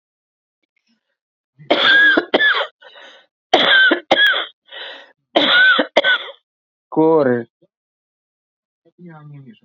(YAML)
three_cough_length: 9.6 s
three_cough_amplitude: 30324
three_cough_signal_mean_std_ratio: 0.48
survey_phase: beta (2021-08-13 to 2022-03-07)
age: 45-64
gender: Female
wearing_mask: 'No'
symptom_runny_or_blocked_nose: true
symptom_abdominal_pain: true
symptom_fatigue: true
symptom_headache: true
symptom_change_to_sense_of_smell_or_taste: true
smoker_status: Ex-smoker
respiratory_condition_asthma: true
respiratory_condition_other: false
recruitment_source: REACT
submission_delay: 3 days
covid_test_result: Negative
covid_test_method: RT-qPCR
influenza_a_test_result: Negative
influenza_b_test_result: Negative